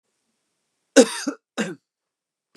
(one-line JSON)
{"cough_length": "2.6 s", "cough_amplitude": 29203, "cough_signal_mean_std_ratio": 0.23, "survey_phase": "beta (2021-08-13 to 2022-03-07)", "age": "45-64", "gender": "Male", "wearing_mask": "No", "symptom_none": true, "symptom_onset": "12 days", "smoker_status": "Never smoked", "respiratory_condition_asthma": false, "respiratory_condition_other": false, "recruitment_source": "REACT", "submission_delay": "2 days", "covid_test_result": "Negative", "covid_test_method": "RT-qPCR", "influenza_a_test_result": "Negative", "influenza_b_test_result": "Negative"}